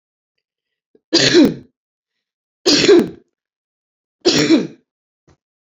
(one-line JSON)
{"three_cough_length": "5.6 s", "three_cough_amplitude": 31236, "three_cough_signal_mean_std_ratio": 0.38, "survey_phase": "beta (2021-08-13 to 2022-03-07)", "age": "18-44", "gender": "Female", "wearing_mask": "No", "symptom_cough_any": true, "symptom_onset": "3 days", "smoker_status": "Current smoker (e-cigarettes or vapes only)", "respiratory_condition_asthma": false, "respiratory_condition_other": false, "recruitment_source": "Test and Trace", "submission_delay": "1 day", "covid_test_result": "Negative", "covid_test_method": "RT-qPCR"}